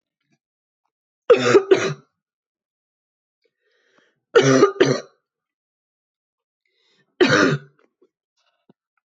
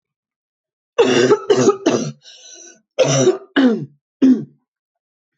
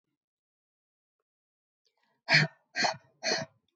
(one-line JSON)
{"three_cough_length": "9.0 s", "three_cough_amplitude": 25813, "three_cough_signal_mean_std_ratio": 0.31, "cough_length": "5.4 s", "cough_amplitude": 24731, "cough_signal_mean_std_ratio": 0.49, "exhalation_length": "3.8 s", "exhalation_amplitude": 14576, "exhalation_signal_mean_std_ratio": 0.28, "survey_phase": "beta (2021-08-13 to 2022-03-07)", "age": "18-44", "gender": "Female", "wearing_mask": "No", "symptom_cough_any": true, "symptom_sore_throat": true, "symptom_headache": true, "symptom_other": true, "smoker_status": "Never smoked", "respiratory_condition_asthma": false, "respiratory_condition_other": false, "recruitment_source": "Test and Trace", "submission_delay": "2 days", "covid_test_result": "Positive", "covid_test_method": "LFT"}